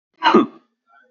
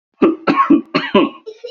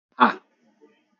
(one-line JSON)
{"cough_length": "1.1 s", "cough_amplitude": 26329, "cough_signal_mean_std_ratio": 0.37, "three_cough_length": "1.7 s", "three_cough_amplitude": 28299, "three_cough_signal_mean_std_ratio": 0.59, "exhalation_length": "1.2 s", "exhalation_amplitude": 26116, "exhalation_signal_mean_std_ratio": 0.24, "survey_phase": "beta (2021-08-13 to 2022-03-07)", "age": "18-44", "gender": "Male", "wearing_mask": "No", "symptom_none": true, "smoker_status": "Never smoked", "respiratory_condition_asthma": false, "respiratory_condition_other": false, "recruitment_source": "REACT", "submission_delay": "1 day", "covid_test_result": "Negative", "covid_test_method": "RT-qPCR", "influenza_a_test_result": "Negative", "influenza_b_test_result": "Negative"}